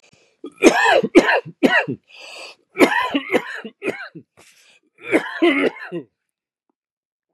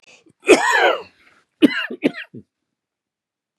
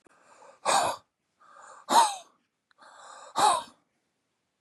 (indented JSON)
{
  "three_cough_length": "7.3 s",
  "three_cough_amplitude": 32768,
  "three_cough_signal_mean_std_ratio": 0.43,
  "cough_length": "3.6 s",
  "cough_amplitude": 32768,
  "cough_signal_mean_std_ratio": 0.35,
  "exhalation_length": "4.6 s",
  "exhalation_amplitude": 14382,
  "exhalation_signal_mean_std_ratio": 0.35,
  "survey_phase": "beta (2021-08-13 to 2022-03-07)",
  "age": "65+",
  "gender": "Male",
  "wearing_mask": "No",
  "symptom_cough_any": true,
  "smoker_status": "Ex-smoker",
  "respiratory_condition_asthma": false,
  "respiratory_condition_other": false,
  "recruitment_source": "Test and Trace",
  "submission_delay": "2 days",
  "covid_test_result": "Negative",
  "covid_test_method": "RT-qPCR"
}